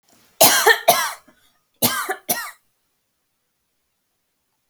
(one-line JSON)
{"cough_length": "4.7 s", "cough_amplitude": 32768, "cough_signal_mean_std_ratio": 0.33, "survey_phase": "alpha (2021-03-01 to 2021-08-12)", "age": "18-44", "gender": "Female", "wearing_mask": "No", "symptom_none": true, "symptom_onset": "6 days", "smoker_status": "Never smoked", "respiratory_condition_asthma": false, "respiratory_condition_other": false, "recruitment_source": "REACT", "submission_delay": "2 days", "covid_test_result": "Negative", "covid_test_method": "RT-qPCR"}